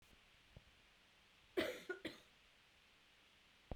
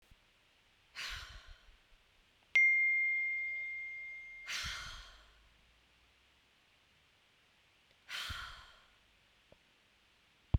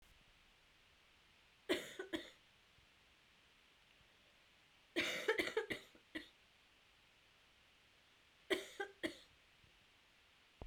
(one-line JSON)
{"cough_length": "3.8 s", "cough_amplitude": 1404, "cough_signal_mean_std_ratio": 0.34, "exhalation_length": "10.6 s", "exhalation_amplitude": 4938, "exhalation_signal_mean_std_ratio": 0.4, "three_cough_length": "10.7 s", "three_cough_amplitude": 2353, "three_cough_signal_mean_std_ratio": 0.33, "survey_phase": "beta (2021-08-13 to 2022-03-07)", "age": "18-44", "gender": "Female", "wearing_mask": "No", "symptom_cough_any": true, "symptom_runny_or_blocked_nose": true, "symptom_onset": "2 days", "smoker_status": "Never smoked", "respiratory_condition_asthma": false, "respiratory_condition_other": false, "recruitment_source": "Test and Trace", "submission_delay": "1 day", "covid_test_result": "Positive", "covid_test_method": "RT-qPCR"}